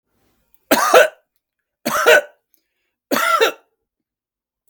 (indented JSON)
{
  "three_cough_length": "4.7 s",
  "three_cough_amplitude": 32768,
  "three_cough_signal_mean_std_ratio": 0.37,
  "survey_phase": "beta (2021-08-13 to 2022-03-07)",
  "age": "45-64",
  "gender": "Male",
  "wearing_mask": "No",
  "symptom_none": true,
  "symptom_onset": "7 days",
  "smoker_status": "Never smoked",
  "respiratory_condition_asthma": false,
  "respiratory_condition_other": false,
  "recruitment_source": "REACT",
  "submission_delay": "2 days",
  "covid_test_result": "Negative",
  "covid_test_method": "RT-qPCR",
  "influenza_a_test_result": "Negative",
  "influenza_b_test_result": "Negative"
}